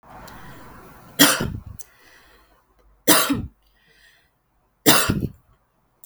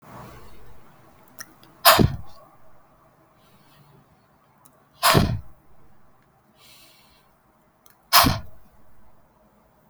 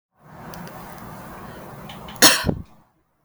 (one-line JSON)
{"three_cough_length": "6.1 s", "three_cough_amplitude": 32768, "three_cough_signal_mean_std_ratio": 0.33, "exhalation_length": "9.9 s", "exhalation_amplitude": 32768, "exhalation_signal_mean_std_ratio": 0.28, "cough_length": "3.2 s", "cough_amplitude": 32768, "cough_signal_mean_std_ratio": 0.32, "survey_phase": "beta (2021-08-13 to 2022-03-07)", "age": "18-44", "gender": "Female", "wearing_mask": "No", "symptom_runny_or_blocked_nose": true, "symptom_sore_throat": true, "symptom_fatigue": true, "symptom_headache": true, "symptom_other": true, "symptom_onset": "4 days", "smoker_status": "Never smoked", "respiratory_condition_asthma": false, "respiratory_condition_other": false, "recruitment_source": "Test and Trace", "submission_delay": "1 day", "covid_test_result": "Positive", "covid_test_method": "RT-qPCR"}